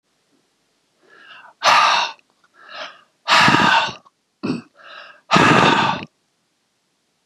{"exhalation_length": "7.3 s", "exhalation_amplitude": 32768, "exhalation_signal_mean_std_ratio": 0.44, "survey_phase": "beta (2021-08-13 to 2022-03-07)", "age": "45-64", "gender": "Male", "wearing_mask": "No", "symptom_cough_any": true, "symptom_runny_or_blocked_nose": true, "symptom_fatigue": true, "symptom_headache": true, "smoker_status": "Never smoked", "respiratory_condition_asthma": false, "respiratory_condition_other": false, "recruitment_source": "Test and Trace", "submission_delay": "2 days", "covid_test_result": "Positive", "covid_test_method": "RT-qPCR", "covid_ct_value": 22.2, "covid_ct_gene": "ORF1ab gene", "covid_ct_mean": 23.3, "covid_viral_load": "22000 copies/ml", "covid_viral_load_category": "Low viral load (10K-1M copies/ml)"}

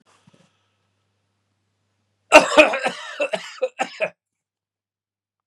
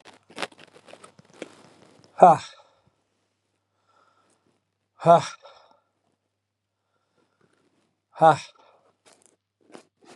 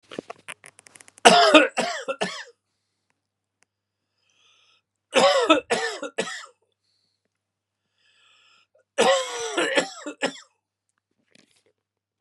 {"cough_length": "5.5 s", "cough_amplitude": 32768, "cough_signal_mean_std_ratio": 0.25, "exhalation_length": "10.2 s", "exhalation_amplitude": 28770, "exhalation_signal_mean_std_ratio": 0.18, "three_cough_length": "12.2 s", "three_cough_amplitude": 32768, "three_cough_signal_mean_std_ratio": 0.32, "survey_phase": "beta (2021-08-13 to 2022-03-07)", "age": "45-64", "gender": "Male", "wearing_mask": "No", "symptom_none": true, "smoker_status": "Never smoked", "respiratory_condition_asthma": true, "respiratory_condition_other": false, "recruitment_source": "REACT", "submission_delay": "1 day", "covid_test_result": "Negative", "covid_test_method": "RT-qPCR", "influenza_a_test_result": "Negative", "influenza_b_test_result": "Negative"}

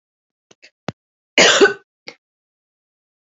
{"cough_length": "3.2 s", "cough_amplitude": 29970, "cough_signal_mean_std_ratio": 0.26, "survey_phase": "alpha (2021-03-01 to 2021-08-12)", "age": "45-64", "gender": "Female", "wearing_mask": "No", "symptom_cough_any": true, "symptom_shortness_of_breath": true, "symptom_abdominal_pain": true, "symptom_fatigue": true, "symptom_fever_high_temperature": true, "symptom_headache": true, "smoker_status": "Never smoked", "respiratory_condition_asthma": false, "respiratory_condition_other": false, "recruitment_source": "Test and Trace", "submission_delay": "1 day", "covid_test_result": "Positive", "covid_test_method": "RT-qPCR", "covid_ct_value": 24.1, "covid_ct_gene": "ORF1ab gene", "covid_ct_mean": 25.8, "covid_viral_load": "3600 copies/ml", "covid_viral_load_category": "Minimal viral load (< 10K copies/ml)"}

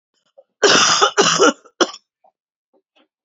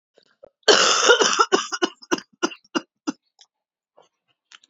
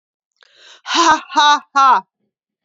{"three_cough_length": "3.2 s", "three_cough_amplitude": 31674, "three_cough_signal_mean_std_ratio": 0.43, "cough_length": "4.7 s", "cough_amplitude": 30163, "cough_signal_mean_std_ratio": 0.37, "exhalation_length": "2.6 s", "exhalation_amplitude": 32768, "exhalation_signal_mean_std_ratio": 0.47, "survey_phase": "beta (2021-08-13 to 2022-03-07)", "age": "45-64", "gender": "Female", "wearing_mask": "No", "symptom_cough_any": true, "symptom_runny_or_blocked_nose": true, "symptom_sore_throat": true, "symptom_onset": "5 days", "smoker_status": "Never smoked", "respiratory_condition_asthma": false, "respiratory_condition_other": false, "recruitment_source": "REACT", "submission_delay": "2 days", "covid_test_result": "Positive", "covid_test_method": "RT-qPCR", "covid_ct_value": 20.0, "covid_ct_gene": "E gene", "influenza_a_test_result": "Negative", "influenza_b_test_result": "Negative"}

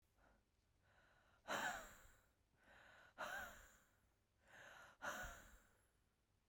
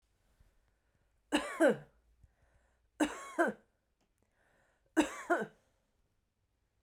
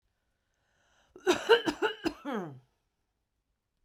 {"exhalation_length": "6.5 s", "exhalation_amplitude": 782, "exhalation_signal_mean_std_ratio": 0.43, "three_cough_length": "6.8 s", "three_cough_amplitude": 5281, "three_cough_signal_mean_std_ratio": 0.29, "cough_length": "3.8 s", "cough_amplitude": 11810, "cough_signal_mean_std_ratio": 0.31, "survey_phase": "beta (2021-08-13 to 2022-03-07)", "age": "45-64", "gender": "Female", "wearing_mask": "No", "symptom_none": true, "smoker_status": "Never smoked", "respiratory_condition_asthma": true, "respiratory_condition_other": false, "recruitment_source": "REACT", "submission_delay": "1 day", "covid_test_result": "Negative", "covid_test_method": "RT-qPCR", "influenza_a_test_result": "Negative", "influenza_b_test_result": "Negative"}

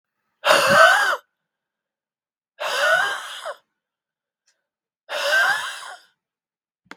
{"exhalation_length": "7.0 s", "exhalation_amplitude": 32767, "exhalation_signal_mean_std_ratio": 0.42, "survey_phase": "beta (2021-08-13 to 2022-03-07)", "age": "45-64", "gender": "Female", "wearing_mask": "No", "symptom_cough_any": true, "symptom_runny_or_blocked_nose": true, "symptom_onset": "3 days", "smoker_status": "Never smoked", "respiratory_condition_asthma": true, "respiratory_condition_other": false, "recruitment_source": "Test and Trace", "submission_delay": "1 day", "covid_test_result": "Positive", "covid_test_method": "RT-qPCR", "covid_ct_value": 30.9, "covid_ct_gene": "N gene"}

